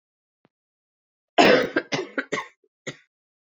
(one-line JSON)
{"cough_length": "3.4 s", "cough_amplitude": 26769, "cough_signal_mean_std_ratio": 0.31, "survey_phase": "beta (2021-08-13 to 2022-03-07)", "age": "18-44", "gender": "Female", "wearing_mask": "No", "symptom_cough_any": true, "symptom_runny_or_blocked_nose": true, "symptom_sore_throat": true, "symptom_fever_high_temperature": true, "symptom_headache": true, "symptom_onset": "4 days", "smoker_status": "Never smoked", "respiratory_condition_asthma": false, "respiratory_condition_other": false, "recruitment_source": "Test and Trace", "submission_delay": "2 days", "covid_test_result": "Positive", "covid_test_method": "RT-qPCR", "covid_ct_value": 30.0, "covid_ct_gene": "ORF1ab gene"}